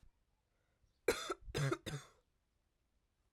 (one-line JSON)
{"cough_length": "3.3 s", "cough_amplitude": 3684, "cough_signal_mean_std_ratio": 0.34, "survey_phase": "alpha (2021-03-01 to 2021-08-12)", "age": "18-44", "gender": "Female", "wearing_mask": "No", "symptom_cough_any": true, "symptom_shortness_of_breath": true, "symptom_headache": true, "smoker_status": "Never smoked", "respiratory_condition_asthma": false, "respiratory_condition_other": false, "recruitment_source": "Test and Trace", "submission_delay": "1 day", "covid_test_result": "Positive", "covid_test_method": "LFT"}